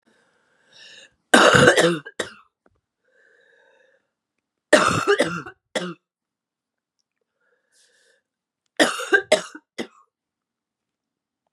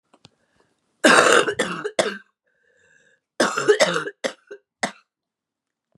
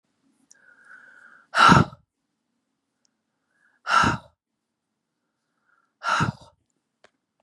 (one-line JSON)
{"three_cough_length": "11.5 s", "three_cough_amplitude": 32767, "three_cough_signal_mean_std_ratio": 0.29, "cough_length": "6.0 s", "cough_amplitude": 32767, "cough_signal_mean_std_ratio": 0.37, "exhalation_length": "7.4 s", "exhalation_amplitude": 30188, "exhalation_signal_mean_std_ratio": 0.25, "survey_phase": "beta (2021-08-13 to 2022-03-07)", "age": "45-64", "gender": "Female", "wearing_mask": "No", "symptom_cough_any": true, "symptom_new_continuous_cough": true, "symptom_runny_or_blocked_nose": true, "symptom_sore_throat": true, "symptom_fatigue": true, "symptom_headache": true, "symptom_change_to_sense_of_smell_or_taste": true, "symptom_loss_of_taste": true, "symptom_onset": "5 days", "smoker_status": "Ex-smoker", "respiratory_condition_asthma": false, "respiratory_condition_other": false, "recruitment_source": "Test and Trace", "submission_delay": "1 day", "covid_test_result": "Positive", "covid_test_method": "RT-qPCR", "covid_ct_value": 24.2, "covid_ct_gene": "N gene", "covid_ct_mean": 24.3, "covid_viral_load": "10000 copies/ml", "covid_viral_load_category": "Low viral load (10K-1M copies/ml)"}